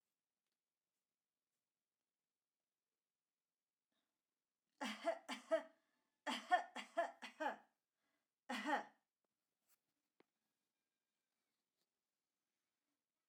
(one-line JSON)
{"three_cough_length": "13.3 s", "three_cough_amplitude": 2255, "three_cough_signal_mean_std_ratio": 0.24, "survey_phase": "alpha (2021-03-01 to 2021-08-12)", "age": "18-44", "gender": "Female", "wearing_mask": "No", "symptom_none": true, "smoker_status": "Never smoked", "respiratory_condition_asthma": false, "respiratory_condition_other": false, "recruitment_source": "REACT", "submission_delay": "1 day", "covid_test_result": "Negative", "covid_test_method": "RT-qPCR"}